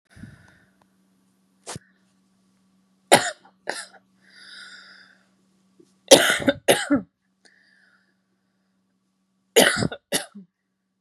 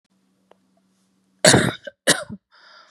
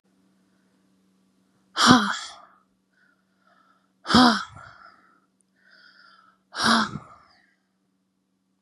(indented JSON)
{
  "three_cough_length": "11.0 s",
  "three_cough_amplitude": 32768,
  "three_cough_signal_mean_std_ratio": 0.24,
  "cough_length": "2.9 s",
  "cough_amplitude": 32768,
  "cough_signal_mean_std_ratio": 0.28,
  "exhalation_length": "8.6 s",
  "exhalation_amplitude": 31891,
  "exhalation_signal_mean_std_ratio": 0.27,
  "survey_phase": "beta (2021-08-13 to 2022-03-07)",
  "age": "18-44",
  "gender": "Female",
  "wearing_mask": "No",
  "symptom_cough_any": true,
  "symptom_runny_or_blocked_nose": true,
  "symptom_sore_throat": true,
  "symptom_onset": "3 days",
  "smoker_status": "Never smoked",
  "respiratory_condition_asthma": false,
  "respiratory_condition_other": false,
  "recruitment_source": "Test and Trace",
  "submission_delay": "2 days",
  "covid_test_result": "Positive",
  "covid_test_method": "RT-qPCR",
  "covid_ct_value": 16.2,
  "covid_ct_gene": "ORF1ab gene",
  "covid_ct_mean": 16.5,
  "covid_viral_load": "3900000 copies/ml",
  "covid_viral_load_category": "High viral load (>1M copies/ml)"
}